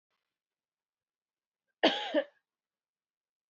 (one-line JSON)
{"cough_length": "3.5 s", "cough_amplitude": 9576, "cough_signal_mean_std_ratio": 0.22, "survey_phase": "beta (2021-08-13 to 2022-03-07)", "age": "18-44", "gender": "Female", "wearing_mask": "No", "symptom_shortness_of_breath": true, "symptom_fatigue": true, "symptom_fever_high_temperature": true, "symptom_headache": true, "symptom_change_to_sense_of_smell_or_taste": true, "smoker_status": "Never smoked", "respiratory_condition_asthma": false, "respiratory_condition_other": false, "recruitment_source": "Test and Trace", "submission_delay": "2 days", "covid_test_result": "Positive", "covid_test_method": "RT-qPCR", "covid_ct_value": 19.1, "covid_ct_gene": "ORF1ab gene", "covid_ct_mean": 20.1, "covid_viral_load": "250000 copies/ml", "covid_viral_load_category": "Low viral load (10K-1M copies/ml)"}